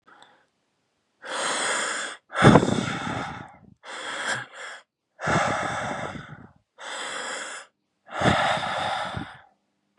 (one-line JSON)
{"exhalation_length": "10.0 s", "exhalation_amplitude": 32767, "exhalation_signal_mean_std_ratio": 0.5, "survey_phase": "beta (2021-08-13 to 2022-03-07)", "age": "18-44", "gender": "Male", "wearing_mask": "No", "symptom_cough_any": true, "symptom_runny_or_blocked_nose": true, "symptom_fatigue": true, "symptom_headache": true, "symptom_change_to_sense_of_smell_or_taste": true, "symptom_other": true, "symptom_onset": "2 days", "smoker_status": "Ex-smoker", "respiratory_condition_asthma": false, "respiratory_condition_other": false, "recruitment_source": "Test and Trace", "submission_delay": "1 day", "covid_test_result": "Positive", "covid_test_method": "RT-qPCR", "covid_ct_value": 19.4, "covid_ct_gene": "ORF1ab gene", "covid_ct_mean": 19.9, "covid_viral_load": "290000 copies/ml", "covid_viral_load_category": "Low viral load (10K-1M copies/ml)"}